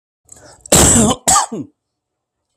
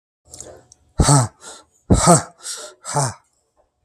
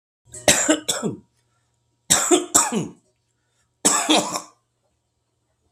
{"cough_length": "2.6 s", "cough_amplitude": 32768, "cough_signal_mean_std_ratio": 0.45, "exhalation_length": "3.8 s", "exhalation_amplitude": 32766, "exhalation_signal_mean_std_ratio": 0.38, "three_cough_length": "5.7 s", "three_cough_amplitude": 32768, "three_cough_signal_mean_std_ratio": 0.41, "survey_phase": "beta (2021-08-13 to 2022-03-07)", "age": "45-64", "gender": "Male", "wearing_mask": "No", "symptom_abdominal_pain": true, "symptom_onset": "12 days", "smoker_status": "Current smoker (11 or more cigarettes per day)", "respiratory_condition_asthma": false, "respiratory_condition_other": true, "recruitment_source": "REACT", "submission_delay": "11 days", "covid_test_result": "Negative", "covid_test_method": "RT-qPCR", "influenza_a_test_result": "Negative", "influenza_b_test_result": "Negative"}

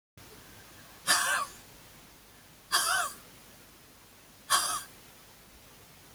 {"exhalation_length": "6.1 s", "exhalation_amplitude": 8915, "exhalation_signal_mean_std_ratio": 0.42, "survey_phase": "beta (2021-08-13 to 2022-03-07)", "age": "65+", "gender": "Female", "wearing_mask": "No", "symptom_none": true, "smoker_status": "Ex-smoker", "respiratory_condition_asthma": false, "respiratory_condition_other": false, "recruitment_source": "REACT", "submission_delay": "2 days", "covid_test_result": "Negative", "covid_test_method": "RT-qPCR", "influenza_a_test_result": "Negative", "influenza_b_test_result": "Negative"}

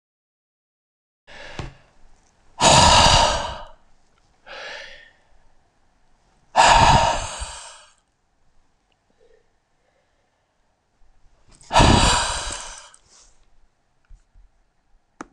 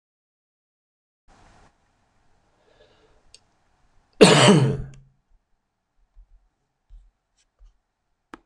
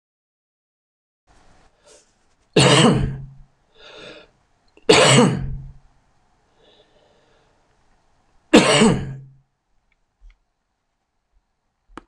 {"exhalation_length": "15.3 s", "exhalation_amplitude": 26023, "exhalation_signal_mean_std_ratio": 0.33, "cough_length": "8.5 s", "cough_amplitude": 26028, "cough_signal_mean_std_ratio": 0.21, "three_cough_length": "12.1 s", "three_cough_amplitude": 26028, "three_cough_signal_mean_std_ratio": 0.31, "survey_phase": "beta (2021-08-13 to 2022-03-07)", "age": "65+", "gender": "Male", "wearing_mask": "No", "symptom_none": true, "smoker_status": "Never smoked", "respiratory_condition_asthma": false, "respiratory_condition_other": false, "recruitment_source": "REACT", "submission_delay": "2 days", "covid_test_result": "Negative", "covid_test_method": "RT-qPCR", "influenza_a_test_result": "Negative", "influenza_b_test_result": "Negative"}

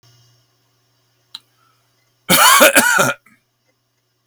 {"cough_length": "4.3 s", "cough_amplitude": 32768, "cough_signal_mean_std_ratio": 0.36, "survey_phase": "beta (2021-08-13 to 2022-03-07)", "age": "65+", "gender": "Male", "wearing_mask": "No", "symptom_none": true, "smoker_status": "Ex-smoker", "respiratory_condition_asthma": false, "respiratory_condition_other": false, "recruitment_source": "REACT", "submission_delay": "3 days", "covid_test_result": "Negative", "covid_test_method": "RT-qPCR", "influenza_a_test_result": "Negative", "influenza_b_test_result": "Negative"}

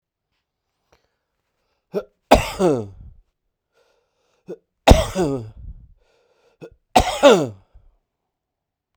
{"three_cough_length": "9.0 s", "three_cough_amplitude": 32768, "three_cough_signal_mean_std_ratio": 0.28, "survey_phase": "beta (2021-08-13 to 2022-03-07)", "age": "65+", "gender": "Male", "wearing_mask": "Yes", "symptom_runny_or_blocked_nose": true, "symptom_fatigue": true, "symptom_loss_of_taste": true, "symptom_other": true, "smoker_status": "Ex-smoker", "respiratory_condition_asthma": false, "respiratory_condition_other": false, "recruitment_source": "Test and Trace", "submission_delay": "2 days", "covid_test_result": "Positive", "covid_test_method": "RT-qPCR", "covid_ct_value": 25.5, "covid_ct_gene": "ORF1ab gene"}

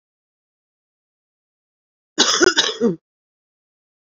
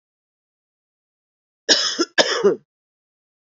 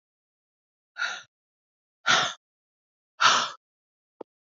{"cough_length": "4.0 s", "cough_amplitude": 32767, "cough_signal_mean_std_ratio": 0.29, "three_cough_length": "3.6 s", "three_cough_amplitude": 32168, "three_cough_signal_mean_std_ratio": 0.32, "exhalation_length": "4.5 s", "exhalation_amplitude": 14825, "exhalation_signal_mean_std_ratio": 0.29, "survey_phase": "beta (2021-08-13 to 2022-03-07)", "age": "45-64", "gender": "Female", "wearing_mask": "No", "symptom_cough_any": true, "symptom_runny_or_blocked_nose": true, "symptom_shortness_of_breath": true, "symptom_sore_throat": true, "smoker_status": "Current smoker (1 to 10 cigarettes per day)", "respiratory_condition_asthma": false, "respiratory_condition_other": false, "recruitment_source": "Test and Trace", "submission_delay": "2 days", "covid_test_result": "Negative", "covid_test_method": "ePCR"}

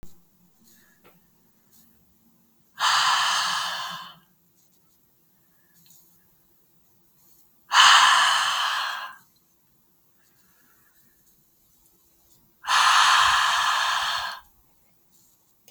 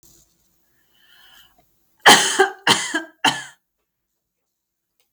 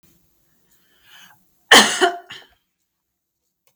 {"exhalation_length": "15.7 s", "exhalation_amplitude": 30145, "exhalation_signal_mean_std_ratio": 0.41, "three_cough_length": "5.1 s", "three_cough_amplitude": 32766, "three_cough_signal_mean_std_ratio": 0.28, "cough_length": "3.8 s", "cough_amplitude": 32768, "cough_signal_mean_std_ratio": 0.24, "survey_phase": "beta (2021-08-13 to 2022-03-07)", "age": "18-44", "gender": "Female", "wearing_mask": "No", "symptom_sore_throat": true, "smoker_status": "Never smoked", "respiratory_condition_asthma": false, "respiratory_condition_other": false, "recruitment_source": "Test and Trace", "submission_delay": "1 day", "covid_test_result": "Negative", "covid_test_method": "RT-qPCR"}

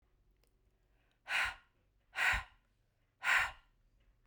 {"exhalation_length": "4.3 s", "exhalation_amplitude": 3683, "exhalation_signal_mean_std_ratio": 0.35, "survey_phase": "beta (2021-08-13 to 2022-03-07)", "age": "45-64", "gender": "Female", "wearing_mask": "No", "symptom_runny_or_blocked_nose": true, "symptom_sore_throat": true, "symptom_fatigue": true, "symptom_headache": true, "smoker_status": "Never smoked", "respiratory_condition_asthma": false, "respiratory_condition_other": false, "recruitment_source": "REACT", "submission_delay": "1 day", "covid_test_result": "Negative", "covid_test_method": "RT-qPCR"}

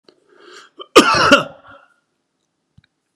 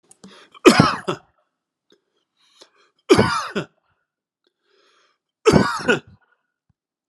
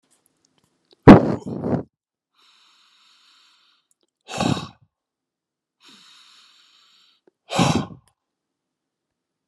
{"cough_length": "3.2 s", "cough_amplitude": 32768, "cough_signal_mean_std_ratio": 0.3, "three_cough_length": "7.1 s", "three_cough_amplitude": 32768, "three_cough_signal_mean_std_ratio": 0.29, "exhalation_length": "9.5 s", "exhalation_amplitude": 32768, "exhalation_signal_mean_std_ratio": 0.2, "survey_phase": "beta (2021-08-13 to 2022-03-07)", "age": "45-64", "gender": "Male", "wearing_mask": "No", "symptom_none": true, "smoker_status": "Ex-smoker", "respiratory_condition_asthma": false, "respiratory_condition_other": false, "recruitment_source": "REACT", "submission_delay": "34 days", "covid_test_result": "Negative", "covid_test_method": "RT-qPCR", "influenza_a_test_result": "Negative", "influenza_b_test_result": "Negative"}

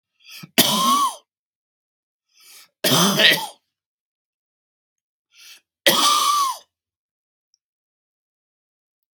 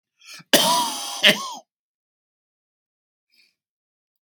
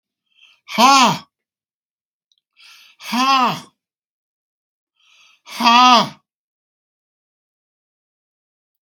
{"three_cough_length": "9.2 s", "three_cough_amplitude": 32767, "three_cough_signal_mean_std_ratio": 0.37, "cough_length": "4.3 s", "cough_amplitude": 32768, "cough_signal_mean_std_ratio": 0.3, "exhalation_length": "8.9 s", "exhalation_amplitude": 32753, "exhalation_signal_mean_std_ratio": 0.31, "survey_phase": "beta (2021-08-13 to 2022-03-07)", "age": "65+", "gender": "Male", "wearing_mask": "No", "symptom_cough_any": true, "symptom_runny_or_blocked_nose": true, "smoker_status": "Ex-smoker", "respiratory_condition_asthma": false, "respiratory_condition_other": false, "recruitment_source": "Test and Trace", "submission_delay": "1 day", "covid_test_result": "Negative", "covid_test_method": "RT-qPCR"}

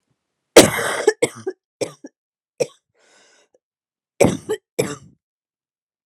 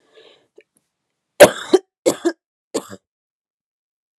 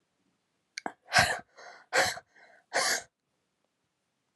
{"cough_length": "6.1 s", "cough_amplitude": 32768, "cough_signal_mean_std_ratio": 0.26, "three_cough_length": "4.2 s", "three_cough_amplitude": 32768, "three_cough_signal_mean_std_ratio": 0.2, "exhalation_length": "4.4 s", "exhalation_amplitude": 11352, "exhalation_signal_mean_std_ratio": 0.33, "survey_phase": "alpha (2021-03-01 to 2021-08-12)", "age": "18-44", "gender": "Female", "wearing_mask": "No", "symptom_cough_any": true, "symptom_headache": true, "symptom_change_to_sense_of_smell_or_taste": true, "smoker_status": "Never smoked", "respiratory_condition_asthma": false, "respiratory_condition_other": false, "recruitment_source": "Test and Trace", "submission_delay": "1 day", "covid_test_result": "Positive", "covid_test_method": "RT-qPCR", "covid_ct_value": 22.7, "covid_ct_gene": "ORF1ab gene"}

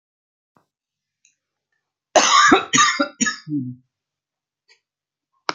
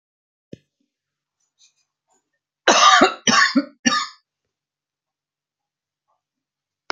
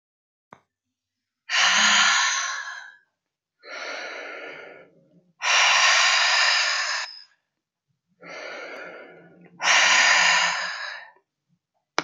{"cough_length": "5.5 s", "cough_amplitude": 31610, "cough_signal_mean_std_ratio": 0.34, "three_cough_length": "6.9 s", "three_cough_amplitude": 29783, "three_cough_signal_mean_std_ratio": 0.29, "exhalation_length": "12.0 s", "exhalation_amplitude": 20796, "exhalation_signal_mean_std_ratio": 0.53, "survey_phase": "beta (2021-08-13 to 2022-03-07)", "age": "45-64", "gender": "Female", "wearing_mask": "No", "symptom_cough_any": true, "smoker_status": "Never smoked", "respiratory_condition_asthma": false, "respiratory_condition_other": false, "recruitment_source": "REACT", "submission_delay": "2 days", "covid_test_result": "Negative", "covid_test_method": "RT-qPCR", "influenza_a_test_result": "Negative", "influenza_b_test_result": "Negative"}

